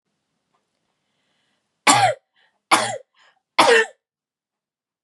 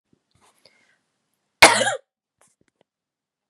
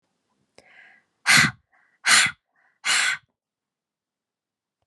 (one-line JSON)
{"three_cough_length": "5.0 s", "three_cough_amplitude": 32622, "three_cough_signal_mean_std_ratio": 0.3, "cough_length": "3.5 s", "cough_amplitude": 32768, "cough_signal_mean_std_ratio": 0.19, "exhalation_length": "4.9 s", "exhalation_amplitude": 24609, "exhalation_signal_mean_std_ratio": 0.31, "survey_phase": "beta (2021-08-13 to 2022-03-07)", "age": "18-44", "gender": "Female", "wearing_mask": "No", "symptom_runny_or_blocked_nose": true, "symptom_sore_throat": true, "symptom_fatigue": true, "symptom_onset": "11 days", "smoker_status": "Ex-smoker", "respiratory_condition_asthma": false, "respiratory_condition_other": false, "recruitment_source": "REACT", "submission_delay": "1 day", "covid_test_result": "Negative", "covid_test_method": "RT-qPCR", "influenza_a_test_result": "Negative", "influenza_b_test_result": "Negative"}